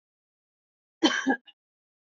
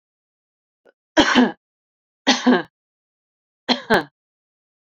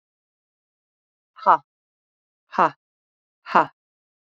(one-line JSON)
{"cough_length": "2.1 s", "cough_amplitude": 11605, "cough_signal_mean_std_ratio": 0.28, "three_cough_length": "4.9 s", "three_cough_amplitude": 29618, "three_cough_signal_mean_std_ratio": 0.32, "exhalation_length": "4.4 s", "exhalation_amplitude": 27313, "exhalation_signal_mean_std_ratio": 0.19, "survey_phase": "beta (2021-08-13 to 2022-03-07)", "age": "45-64", "gender": "Female", "wearing_mask": "No", "symptom_runny_or_blocked_nose": true, "symptom_sore_throat": true, "symptom_headache": true, "symptom_other": true, "smoker_status": "Never smoked", "respiratory_condition_asthma": false, "respiratory_condition_other": false, "recruitment_source": "Test and Trace", "submission_delay": "2 days", "covid_test_result": "Positive", "covid_test_method": "RT-qPCR", "covid_ct_value": 19.8, "covid_ct_gene": "ORF1ab gene"}